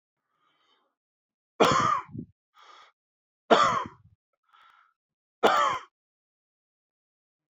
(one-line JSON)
{"three_cough_length": "7.5 s", "three_cough_amplitude": 21890, "three_cough_signal_mean_std_ratio": 0.3, "survey_phase": "beta (2021-08-13 to 2022-03-07)", "age": "45-64", "gender": "Male", "wearing_mask": "No", "symptom_cough_any": true, "symptom_shortness_of_breath": true, "symptom_fatigue": true, "symptom_change_to_sense_of_smell_or_taste": true, "smoker_status": "Never smoked", "respiratory_condition_asthma": false, "respiratory_condition_other": false, "recruitment_source": "Test and Trace", "submission_delay": "2 days", "covid_test_result": "Positive", "covid_test_method": "RT-qPCR", "covid_ct_value": 20.4, "covid_ct_gene": "ORF1ab gene"}